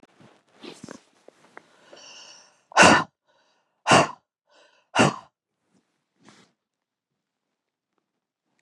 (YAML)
exhalation_length: 8.6 s
exhalation_amplitude: 31789
exhalation_signal_mean_std_ratio: 0.22
survey_phase: beta (2021-08-13 to 2022-03-07)
age: 65+
gender: Female
wearing_mask: 'No'
symptom_none: true
smoker_status: Ex-smoker
respiratory_condition_asthma: false
respiratory_condition_other: false
recruitment_source: REACT
submission_delay: 2 days
covid_test_result: Negative
covid_test_method: RT-qPCR
influenza_a_test_result: Negative
influenza_b_test_result: Negative